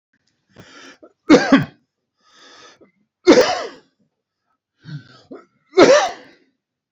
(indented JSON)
{
  "three_cough_length": "6.9 s",
  "three_cough_amplitude": 31946,
  "three_cough_signal_mean_std_ratio": 0.3,
  "survey_phase": "beta (2021-08-13 to 2022-03-07)",
  "age": "65+",
  "gender": "Male",
  "wearing_mask": "No",
  "symptom_none": true,
  "smoker_status": "Never smoked",
  "respiratory_condition_asthma": false,
  "respiratory_condition_other": false,
  "recruitment_source": "REACT",
  "submission_delay": "2 days",
  "covid_test_result": "Negative",
  "covid_test_method": "RT-qPCR",
  "influenza_a_test_result": "Negative",
  "influenza_b_test_result": "Negative"
}